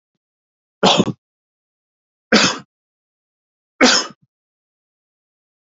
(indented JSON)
{
  "three_cough_length": "5.6 s",
  "three_cough_amplitude": 28907,
  "three_cough_signal_mean_std_ratio": 0.27,
  "survey_phase": "beta (2021-08-13 to 2022-03-07)",
  "age": "45-64",
  "gender": "Male",
  "wearing_mask": "No",
  "symptom_cough_any": true,
  "symptom_runny_or_blocked_nose": true,
  "symptom_shortness_of_breath": true,
  "symptom_fatigue": true,
  "smoker_status": "Ex-smoker",
  "respiratory_condition_asthma": false,
  "respiratory_condition_other": true,
  "recruitment_source": "Test and Trace",
  "submission_delay": "1 day",
  "covid_test_result": "Negative",
  "covid_test_method": "ePCR"
}